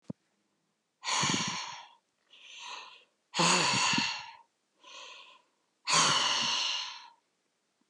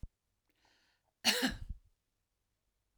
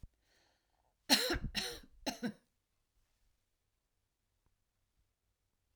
{"exhalation_length": "7.9 s", "exhalation_amplitude": 8809, "exhalation_signal_mean_std_ratio": 0.5, "cough_length": "3.0 s", "cough_amplitude": 5788, "cough_signal_mean_std_ratio": 0.28, "three_cough_length": "5.8 s", "three_cough_amplitude": 8395, "three_cough_signal_mean_std_ratio": 0.26, "survey_phase": "alpha (2021-03-01 to 2021-08-12)", "age": "45-64", "gender": "Female", "wearing_mask": "No", "symptom_none": true, "smoker_status": "Never smoked", "respiratory_condition_asthma": false, "respiratory_condition_other": false, "recruitment_source": "REACT", "submission_delay": "1 day", "covid_test_result": "Negative", "covid_test_method": "RT-qPCR"}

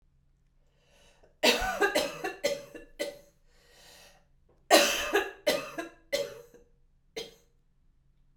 {"cough_length": "8.4 s", "cough_amplitude": 16257, "cough_signal_mean_std_ratio": 0.38, "survey_phase": "beta (2021-08-13 to 2022-03-07)", "age": "18-44", "gender": "Female", "wearing_mask": "No", "symptom_cough_any": true, "symptom_shortness_of_breath": true, "symptom_diarrhoea": true, "symptom_fatigue": true, "symptom_change_to_sense_of_smell_or_taste": true, "symptom_loss_of_taste": true, "symptom_other": true, "smoker_status": "Never smoked", "respiratory_condition_asthma": true, "respiratory_condition_other": false, "recruitment_source": "Test and Trace", "submission_delay": "2 days", "covid_test_result": "Positive", "covid_test_method": "RT-qPCR", "covid_ct_value": 20.1, "covid_ct_gene": "ORF1ab gene", "covid_ct_mean": 20.3, "covid_viral_load": "210000 copies/ml", "covid_viral_load_category": "Low viral load (10K-1M copies/ml)"}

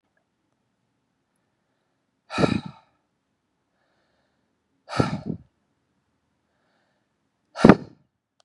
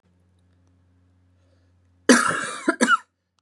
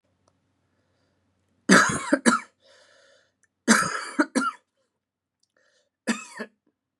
{"exhalation_length": "8.4 s", "exhalation_amplitude": 32768, "exhalation_signal_mean_std_ratio": 0.17, "cough_length": "3.4 s", "cough_amplitude": 31152, "cough_signal_mean_std_ratio": 0.32, "three_cough_length": "7.0 s", "three_cough_amplitude": 27292, "three_cough_signal_mean_std_ratio": 0.31, "survey_phase": "beta (2021-08-13 to 2022-03-07)", "age": "18-44", "gender": "Male", "wearing_mask": "No", "symptom_none": true, "symptom_onset": "6 days", "smoker_status": "Never smoked", "respiratory_condition_asthma": false, "respiratory_condition_other": false, "recruitment_source": "REACT", "submission_delay": "1 day", "covid_test_result": "Positive", "covid_test_method": "RT-qPCR", "covid_ct_value": 21.9, "covid_ct_gene": "E gene", "influenza_a_test_result": "Negative", "influenza_b_test_result": "Negative"}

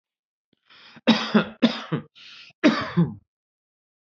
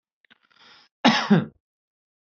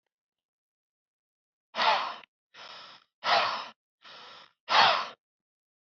{"three_cough_length": "4.1 s", "three_cough_amplitude": 21038, "three_cough_signal_mean_std_ratio": 0.37, "cough_length": "2.3 s", "cough_amplitude": 27282, "cough_signal_mean_std_ratio": 0.3, "exhalation_length": "5.8 s", "exhalation_amplitude": 16091, "exhalation_signal_mean_std_ratio": 0.35, "survey_phase": "beta (2021-08-13 to 2022-03-07)", "age": "18-44", "gender": "Male", "wearing_mask": "No", "symptom_none": true, "smoker_status": "Never smoked", "respiratory_condition_asthma": false, "respiratory_condition_other": false, "recruitment_source": "REACT", "submission_delay": "1 day", "covid_test_result": "Negative", "covid_test_method": "RT-qPCR"}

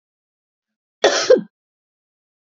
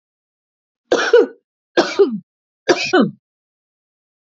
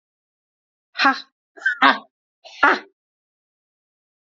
{"cough_length": "2.6 s", "cough_amplitude": 27859, "cough_signal_mean_std_ratio": 0.26, "three_cough_length": "4.4 s", "three_cough_amplitude": 27999, "three_cough_signal_mean_std_ratio": 0.36, "exhalation_length": "4.3 s", "exhalation_amplitude": 29994, "exhalation_signal_mean_std_ratio": 0.27, "survey_phase": "beta (2021-08-13 to 2022-03-07)", "age": "45-64", "gender": "Female", "wearing_mask": "No", "symptom_none": true, "smoker_status": "Ex-smoker", "respiratory_condition_asthma": false, "respiratory_condition_other": false, "recruitment_source": "REACT", "submission_delay": "5 days", "covid_test_result": "Negative", "covid_test_method": "RT-qPCR"}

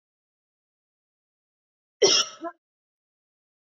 {"cough_length": "3.8 s", "cough_amplitude": 16774, "cough_signal_mean_std_ratio": 0.21, "survey_phase": "beta (2021-08-13 to 2022-03-07)", "age": "45-64", "gender": "Female", "wearing_mask": "No", "symptom_none": true, "smoker_status": "Never smoked", "respiratory_condition_asthma": false, "respiratory_condition_other": false, "recruitment_source": "REACT", "submission_delay": "1 day", "covid_test_result": "Negative", "covid_test_method": "RT-qPCR", "influenza_a_test_result": "Negative", "influenza_b_test_result": "Negative"}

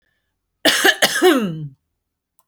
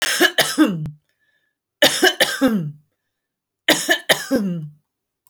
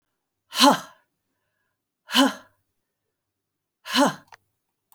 {"cough_length": "2.5 s", "cough_amplitude": 32768, "cough_signal_mean_std_ratio": 0.46, "three_cough_length": "5.3 s", "three_cough_amplitude": 32145, "three_cough_signal_mean_std_ratio": 0.5, "exhalation_length": "4.9 s", "exhalation_amplitude": 24036, "exhalation_signal_mean_std_ratio": 0.28, "survey_phase": "beta (2021-08-13 to 2022-03-07)", "age": "45-64", "gender": "Female", "wearing_mask": "No", "symptom_none": true, "smoker_status": "Current smoker (1 to 10 cigarettes per day)", "respiratory_condition_asthma": false, "respiratory_condition_other": false, "recruitment_source": "REACT", "submission_delay": "2 days", "covid_test_result": "Negative", "covid_test_method": "RT-qPCR"}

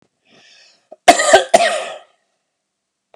{"cough_length": "3.2 s", "cough_amplitude": 32768, "cough_signal_mean_std_ratio": 0.33, "survey_phase": "beta (2021-08-13 to 2022-03-07)", "age": "45-64", "gender": "Male", "wearing_mask": "No", "symptom_none": true, "smoker_status": "Never smoked", "respiratory_condition_asthma": false, "respiratory_condition_other": false, "recruitment_source": "REACT", "submission_delay": "2 days", "covid_test_result": "Negative", "covid_test_method": "RT-qPCR", "influenza_a_test_result": "Unknown/Void", "influenza_b_test_result": "Unknown/Void"}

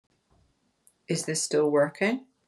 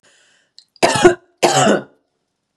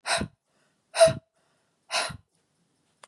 {"three_cough_length": "2.5 s", "three_cough_amplitude": 9836, "three_cough_signal_mean_std_ratio": 0.51, "cough_length": "2.6 s", "cough_amplitude": 32768, "cough_signal_mean_std_ratio": 0.41, "exhalation_length": "3.1 s", "exhalation_amplitude": 17641, "exhalation_signal_mean_std_ratio": 0.29, "survey_phase": "beta (2021-08-13 to 2022-03-07)", "age": "18-44", "gender": "Female", "wearing_mask": "No", "symptom_none": true, "symptom_onset": "6 days", "smoker_status": "Never smoked", "respiratory_condition_asthma": false, "respiratory_condition_other": false, "recruitment_source": "REACT", "submission_delay": "2 days", "covid_test_result": "Negative", "covid_test_method": "RT-qPCR"}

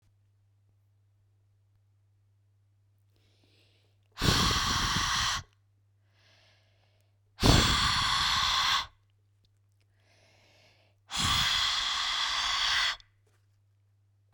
{"exhalation_length": "14.3 s", "exhalation_amplitude": 12969, "exhalation_signal_mean_std_ratio": 0.48, "survey_phase": "beta (2021-08-13 to 2022-03-07)", "age": "45-64", "gender": "Female", "wearing_mask": "No", "symptom_none": true, "smoker_status": "Never smoked", "respiratory_condition_asthma": false, "respiratory_condition_other": false, "recruitment_source": "REACT", "submission_delay": "7 days", "covid_test_result": "Negative", "covid_test_method": "RT-qPCR"}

